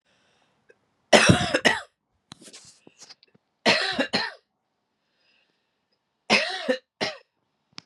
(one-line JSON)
{"three_cough_length": "7.9 s", "three_cough_amplitude": 32767, "three_cough_signal_mean_std_ratio": 0.32, "survey_phase": "beta (2021-08-13 to 2022-03-07)", "age": "45-64", "gender": "Female", "wearing_mask": "No", "symptom_runny_or_blocked_nose": true, "symptom_sore_throat": true, "symptom_headache": true, "symptom_onset": "4 days", "smoker_status": "Never smoked", "respiratory_condition_asthma": false, "respiratory_condition_other": false, "recruitment_source": "Test and Trace", "submission_delay": "2 days", "covid_test_result": "Positive", "covid_test_method": "RT-qPCR", "covid_ct_value": 16.8, "covid_ct_gene": "N gene", "covid_ct_mean": 16.8, "covid_viral_load": "3000000 copies/ml", "covid_viral_load_category": "High viral load (>1M copies/ml)"}